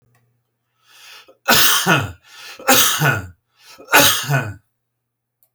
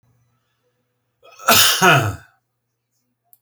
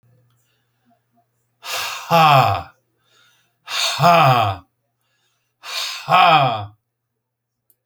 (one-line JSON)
{"three_cough_length": "5.5 s", "three_cough_amplitude": 32768, "three_cough_signal_mean_std_ratio": 0.45, "cough_length": "3.4 s", "cough_amplitude": 32768, "cough_signal_mean_std_ratio": 0.35, "exhalation_length": "7.9 s", "exhalation_amplitude": 30377, "exhalation_signal_mean_std_ratio": 0.43, "survey_phase": "beta (2021-08-13 to 2022-03-07)", "age": "65+", "gender": "Male", "wearing_mask": "No", "symptom_none": true, "smoker_status": "Ex-smoker", "respiratory_condition_asthma": false, "respiratory_condition_other": false, "recruitment_source": "REACT", "submission_delay": "3 days", "covid_test_result": "Negative", "covid_test_method": "RT-qPCR", "influenza_a_test_result": "Negative", "influenza_b_test_result": "Negative"}